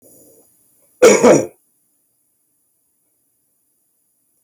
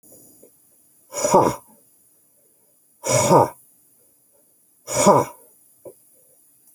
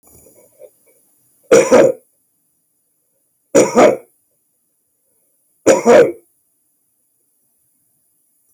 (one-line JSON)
{"cough_length": "4.4 s", "cough_amplitude": 29428, "cough_signal_mean_std_ratio": 0.25, "exhalation_length": "6.7 s", "exhalation_amplitude": 27883, "exhalation_signal_mean_std_ratio": 0.32, "three_cough_length": "8.5 s", "three_cough_amplitude": 30219, "three_cough_signal_mean_std_ratio": 0.31, "survey_phase": "beta (2021-08-13 to 2022-03-07)", "age": "65+", "gender": "Male", "wearing_mask": "No", "symptom_none": true, "smoker_status": "Never smoked", "respiratory_condition_asthma": false, "respiratory_condition_other": false, "recruitment_source": "REACT", "submission_delay": "2 days", "covid_test_result": "Negative", "covid_test_method": "RT-qPCR"}